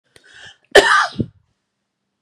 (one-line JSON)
{"cough_length": "2.2 s", "cough_amplitude": 32768, "cough_signal_mean_std_ratio": 0.31, "survey_phase": "beta (2021-08-13 to 2022-03-07)", "age": "18-44", "gender": "Female", "wearing_mask": "No", "symptom_none": true, "smoker_status": "Ex-smoker", "respiratory_condition_asthma": false, "respiratory_condition_other": false, "recruitment_source": "REACT", "submission_delay": "1 day", "covid_test_result": "Negative", "covid_test_method": "RT-qPCR", "influenza_a_test_result": "Negative", "influenza_b_test_result": "Negative"}